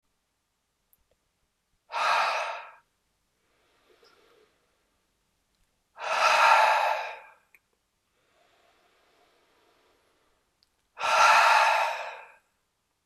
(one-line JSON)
{"exhalation_length": "13.1 s", "exhalation_amplitude": 14039, "exhalation_signal_mean_std_ratio": 0.36, "survey_phase": "beta (2021-08-13 to 2022-03-07)", "age": "45-64", "gender": "Male", "wearing_mask": "No", "symptom_runny_or_blocked_nose": true, "symptom_headache": true, "smoker_status": "Never smoked", "respiratory_condition_asthma": true, "respiratory_condition_other": false, "recruitment_source": "Test and Trace", "submission_delay": "1 day", "covid_test_result": "Positive", "covid_test_method": "LFT"}